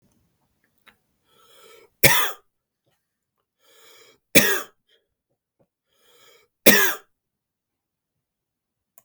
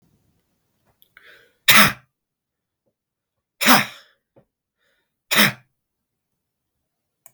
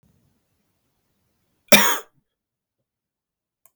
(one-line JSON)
{"three_cough_length": "9.0 s", "three_cough_amplitude": 32768, "three_cough_signal_mean_std_ratio": 0.22, "exhalation_length": "7.3 s", "exhalation_amplitude": 32768, "exhalation_signal_mean_std_ratio": 0.23, "cough_length": "3.8 s", "cough_amplitude": 32768, "cough_signal_mean_std_ratio": 0.19, "survey_phase": "beta (2021-08-13 to 2022-03-07)", "age": "18-44", "gender": "Male", "wearing_mask": "No", "symptom_none": true, "smoker_status": "Ex-smoker", "respiratory_condition_asthma": true, "respiratory_condition_other": false, "recruitment_source": "REACT", "submission_delay": "1 day", "covid_test_result": "Negative", "covid_test_method": "RT-qPCR", "influenza_a_test_result": "Negative", "influenza_b_test_result": "Negative"}